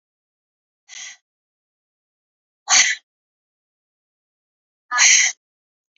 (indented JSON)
{
  "exhalation_length": "6.0 s",
  "exhalation_amplitude": 29515,
  "exhalation_signal_mean_std_ratio": 0.26,
  "survey_phase": "beta (2021-08-13 to 2022-03-07)",
  "age": "18-44",
  "gender": "Female",
  "wearing_mask": "No",
  "symptom_new_continuous_cough": true,
  "symptom_runny_or_blocked_nose": true,
  "symptom_fatigue": true,
  "symptom_fever_high_temperature": true,
  "symptom_headache": true,
  "symptom_change_to_sense_of_smell_or_taste": true,
  "symptom_other": true,
  "symptom_onset": "3 days",
  "smoker_status": "Never smoked",
  "respiratory_condition_asthma": false,
  "respiratory_condition_other": false,
  "recruitment_source": "Test and Trace",
  "submission_delay": "2 days",
  "covid_test_result": "Positive",
  "covid_test_method": "RT-qPCR"
}